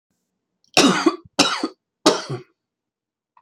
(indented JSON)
{
  "three_cough_length": "3.4 s",
  "three_cough_amplitude": 31184,
  "three_cough_signal_mean_std_ratio": 0.36,
  "survey_phase": "alpha (2021-03-01 to 2021-08-12)",
  "age": "45-64",
  "gender": "Male",
  "wearing_mask": "No",
  "symptom_none": true,
  "smoker_status": "Ex-smoker",
  "respiratory_condition_asthma": true,
  "respiratory_condition_other": false,
  "recruitment_source": "REACT",
  "submission_delay": "2 days",
  "covid_test_result": "Negative",
  "covid_test_method": "RT-qPCR"
}